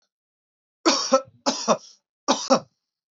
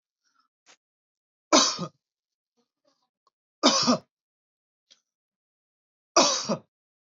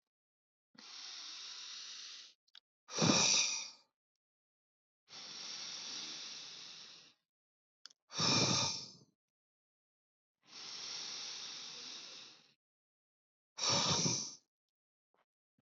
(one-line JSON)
{"cough_length": "3.2 s", "cough_amplitude": 19972, "cough_signal_mean_std_ratio": 0.37, "three_cough_length": "7.2 s", "three_cough_amplitude": 18555, "three_cough_signal_mean_std_ratio": 0.27, "exhalation_length": "15.6 s", "exhalation_amplitude": 4410, "exhalation_signal_mean_std_ratio": 0.41, "survey_phase": "beta (2021-08-13 to 2022-03-07)", "age": "18-44", "gender": "Male", "wearing_mask": "No", "symptom_none": true, "smoker_status": "Never smoked", "respiratory_condition_asthma": false, "respiratory_condition_other": false, "recruitment_source": "REACT", "submission_delay": "1 day", "covid_test_result": "Negative", "covid_test_method": "RT-qPCR"}